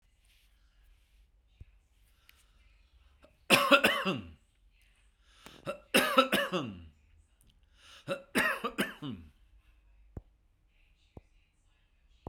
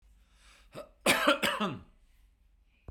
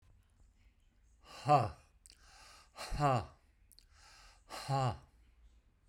{"three_cough_length": "12.3 s", "three_cough_amplitude": 14139, "three_cough_signal_mean_std_ratio": 0.3, "cough_length": "2.9 s", "cough_amplitude": 10067, "cough_signal_mean_std_ratio": 0.38, "exhalation_length": "5.9 s", "exhalation_amplitude": 5145, "exhalation_signal_mean_std_ratio": 0.35, "survey_phase": "beta (2021-08-13 to 2022-03-07)", "age": "65+", "gender": "Male", "wearing_mask": "No", "symptom_none": true, "smoker_status": "Never smoked", "respiratory_condition_asthma": false, "respiratory_condition_other": false, "recruitment_source": "REACT", "submission_delay": "3 days", "covid_test_result": "Negative", "covid_test_method": "RT-qPCR"}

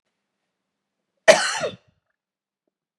{"cough_length": "3.0 s", "cough_amplitude": 32767, "cough_signal_mean_std_ratio": 0.22, "survey_phase": "beta (2021-08-13 to 2022-03-07)", "age": "45-64", "gender": "Female", "wearing_mask": "No", "symptom_cough_any": true, "symptom_runny_or_blocked_nose": true, "symptom_shortness_of_breath": true, "symptom_sore_throat": true, "symptom_fatigue": true, "symptom_headache": true, "symptom_change_to_sense_of_smell_or_taste": true, "symptom_loss_of_taste": true, "symptom_other": true, "symptom_onset": "3 days", "smoker_status": "Ex-smoker", "respiratory_condition_asthma": true, "respiratory_condition_other": false, "recruitment_source": "Test and Trace", "submission_delay": "2 days", "covid_test_result": "Positive", "covid_test_method": "RT-qPCR", "covid_ct_value": 26.4, "covid_ct_gene": "ORF1ab gene"}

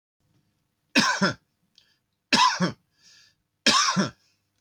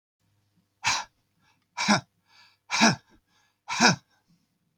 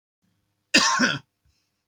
{"three_cough_length": "4.6 s", "three_cough_amplitude": 18453, "three_cough_signal_mean_std_ratio": 0.4, "exhalation_length": "4.8 s", "exhalation_amplitude": 20813, "exhalation_signal_mean_std_ratio": 0.32, "cough_length": "1.9 s", "cough_amplitude": 20053, "cough_signal_mean_std_ratio": 0.37, "survey_phase": "beta (2021-08-13 to 2022-03-07)", "age": "45-64", "gender": "Male", "wearing_mask": "No", "symptom_none": true, "smoker_status": "Ex-smoker", "respiratory_condition_asthma": false, "respiratory_condition_other": false, "recruitment_source": "REACT", "submission_delay": "3 days", "covid_test_result": "Negative", "covid_test_method": "RT-qPCR", "influenza_a_test_result": "Negative", "influenza_b_test_result": "Negative"}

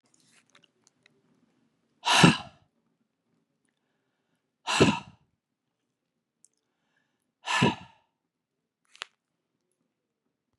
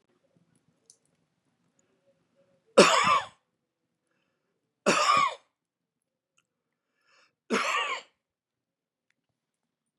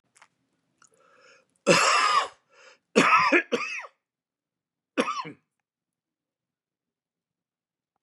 {"exhalation_length": "10.6 s", "exhalation_amplitude": 24935, "exhalation_signal_mean_std_ratio": 0.21, "three_cough_length": "10.0 s", "three_cough_amplitude": 23664, "three_cough_signal_mean_std_ratio": 0.27, "cough_length": "8.0 s", "cough_amplitude": 22144, "cough_signal_mean_std_ratio": 0.34, "survey_phase": "beta (2021-08-13 to 2022-03-07)", "age": "65+", "gender": "Male", "wearing_mask": "No", "symptom_none": true, "smoker_status": "Ex-smoker", "respiratory_condition_asthma": false, "respiratory_condition_other": false, "recruitment_source": "REACT", "submission_delay": "2 days", "covid_test_result": "Negative", "covid_test_method": "RT-qPCR", "influenza_a_test_result": "Negative", "influenza_b_test_result": "Negative"}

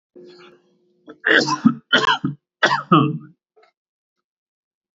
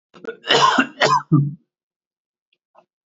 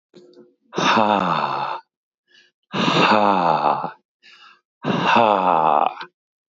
{"three_cough_length": "4.9 s", "three_cough_amplitude": 27649, "three_cough_signal_mean_std_ratio": 0.37, "cough_length": "3.1 s", "cough_amplitude": 26725, "cough_signal_mean_std_ratio": 0.43, "exhalation_length": "6.5 s", "exhalation_amplitude": 26793, "exhalation_signal_mean_std_ratio": 0.57, "survey_phase": "beta (2021-08-13 to 2022-03-07)", "age": "45-64", "gender": "Female", "wearing_mask": "No", "symptom_cough_any": true, "symptom_runny_or_blocked_nose": true, "symptom_fatigue": true, "smoker_status": "Never smoked", "respiratory_condition_asthma": false, "respiratory_condition_other": true, "recruitment_source": "Test and Trace", "submission_delay": "0 days", "covid_test_result": "Positive", "covid_test_method": "LFT"}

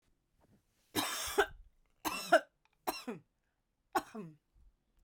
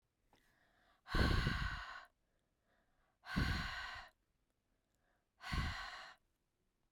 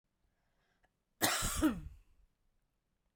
{"three_cough_length": "5.0 s", "three_cough_amplitude": 7287, "three_cough_signal_mean_std_ratio": 0.31, "exhalation_length": "6.9 s", "exhalation_amplitude": 2836, "exhalation_signal_mean_std_ratio": 0.42, "cough_length": "3.2 s", "cough_amplitude": 4801, "cough_signal_mean_std_ratio": 0.35, "survey_phase": "beta (2021-08-13 to 2022-03-07)", "age": "18-44", "gender": "Female", "wearing_mask": "No", "symptom_cough_any": true, "symptom_runny_or_blocked_nose": true, "symptom_fatigue": true, "symptom_headache": true, "smoker_status": "Never smoked", "respiratory_condition_asthma": false, "respiratory_condition_other": false, "recruitment_source": "Test and Trace", "submission_delay": "2 days", "covid_test_result": "Positive", "covid_test_method": "RT-qPCR", "covid_ct_value": 18.0, "covid_ct_gene": "N gene"}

